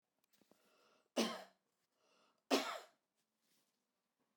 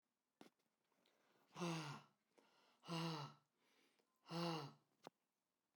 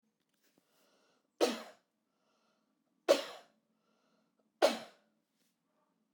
{"cough_length": "4.4 s", "cough_amplitude": 3222, "cough_signal_mean_std_ratio": 0.25, "exhalation_length": "5.8 s", "exhalation_amplitude": 677, "exhalation_signal_mean_std_ratio": 0.41, "three_cough_length": "6.1 s", "three_cough_amplitude": 7743, "three_cough_signal_mean_std_ratio": 0.2, "survey_phase": "beta (2021-08-13 to 2022-03-07)", "age": "45-64", "gender": "Male", "wearing_mask": "No", "symptom_none": true, "smoker_status": "Never smoked", "respiratory_condition_asthma": false, "respiratory_condition_other": false, "recruitment_source": "REACT", "submission_delay": "1 day", "covid_test_result": "Negative", "covid_test_method": "RT-qPCR"}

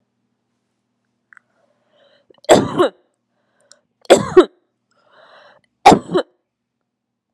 {"three_cough_length": "7.3 s", "three_cough_amplitude": 32768, "three_cough_signal_mean_std_ratio": 0.24, "survey_phase": "beta (2021-08-13 to 2022-03-07)", "age": "18-44", "gender": "Female", "wearing_mask": "No", "symptom_none": true, "smoker_status": "Ex-smoker", "respiratory_condition_asthma": false, "respiratory_condition_other": false, "recruitment_source": "REACT", "submission_delay": "0 days", "covid_test_result": "Negative", "covid_test_method": "RT-qPCR"}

